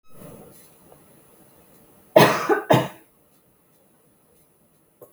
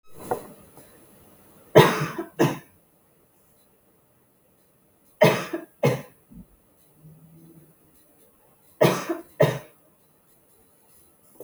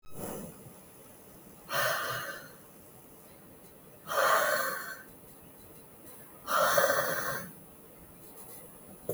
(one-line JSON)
{"cough_length": "5.1 s", "cough_amplitude": 32766, "cough_signal_mean_std_ratio": 0.26, "three_cough_length": "11.4 s", "three_cough_amplitude": 32768, "three_cough_signal_mean_std_ratio": 0.27, "exhalation_length": "9.1 s", "exhalation_amplitude": 9021, "exhalation_signal_mean_std_ratio": 0.53, "survey_phase": "beta (2021-08-13 to 2022-03-07)", "age": "18-44", "gender": "Female", "wearing_mask": "No", "symptom_none": true, "smoker_status": "Never smoked", "respiratory_condition_asthma": false, "respiratory_condition_other": false, "recruitment_source": "REACT", "submission_delay": "1 day", "covid_test_result": "Negative", "covid_test_method": "RT-qPCR"}